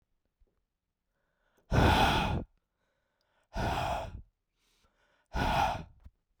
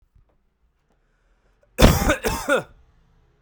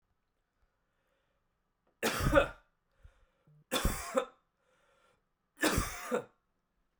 {"exhalation_length": "6.4 s", "exhalation_amplitude": 7867, "exhalation_signal_mean_std_ratio": 0.42, "cough_length": "3.4 s", "cough_amplitude": 32768, "cough_signal_mean_std_ratio": 0.32, "three_cough_length": "7.0 s", "three_cough_amplitude": 8128, "three_cough_signal_mean_std_ratio": 0.33, "survey_phase": "beta (2021-08-13 to 2022-03-07)", "age": "18-44", "gender": "Male", "wearing_mask": "No", "symptom_none": true, "smoker_status": "Prefer not to say", "respiratory_condition_asthma": false, "respiratory_condition_other": false, "recruitment_source": "Test and Trace", "submission_delay": "1 day", "covid_test_result": "Positive", "covid_test_method": "RT-qPCR", "covid_ct_value": 27.1, "covid_ct_gene": "N gene"}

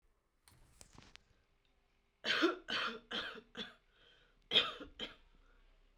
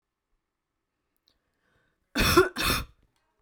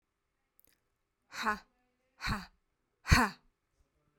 {"three_cough_length": "6.0 s", "three_cough_amplitude": 6627, "three_cough_signal_mean_std_ratio": 0.35, "cough_length": "3.4 s", "cough_amplitude": 18397, "cough_signal_mean_std_ratio": 0.31, "exhalation_length": "4.2 s", "exhalation_amplitude": 12151, "exhalation_signal_mean_std_ratio": 0.25, "survey_phase": "beta (2021-08-13 to 2022-03-07)", "age": "18-44", "gender": "Female", "wearing_mask": "No", "symptom_none": true, "smoker_status": "Never smoked", "respiratory_condition_asthma": false, "respiratory_condition_other": false, "recruitment_source": "REACT", "submission_delay": "5 days", "covid_test_result": "Negative", "covid_test_method": "RT-qPCR"}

